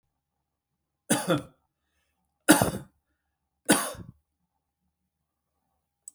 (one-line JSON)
{"three_cough_length": "6.1 s", "three_cough_amplitude": 26274, "three_cough_signal_mean_std_ratio": 0.24, "survey_phase": "beta (2021-08-13 to 2022-03-07)", "age": "45-64", "gender": "Male", "wearing_mask": "No", "symptom_none": true, "symptom_onset": "3 days", "smoker_status": "Ex-smoker", "respiratory_condition_asthma": false, "respiratory_condition_other": false, "recruitment_source": "REACT", "submission_delay": "2 days", "covid_test_result": "Negative", "covid_test_method": "RT-qPCR", "influenza_a_test_result": "Unknown/Void", "influenza_b_test_result": "Unknown/Void"}